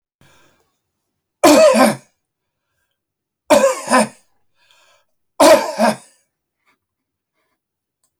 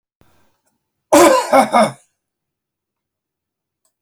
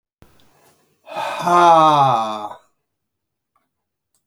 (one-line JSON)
{"three_cough_length": "8.2 s", "three_cough_amplitude": 31834, "three_cough_signal_mean_std_ratio": 0.34, "cough_length": "4.0 s", "cough_amplitude": 29468, "cough_signal_mean_std_ratio": 0.33, "exhalation_length": "4.3 s", "exhalation_amplitude": 30990, "exhalation_signal_mean_std_ratio": 0.42, "survey_phase": "beta (2021-08-13 to 2022-03-07)", "age": "65+", "gender": "Male", "wearing_mask": "No", "symptom_none": true, "smoker_status": "Ex-smoker", "respiratory_condition_asthma": false, "respiratory_condition_other": true, "recruitment_source": "REACT", "submission_delay": "1 day", "covid_test_result": "Negative", "covid_test_method": "RT-qPCR"}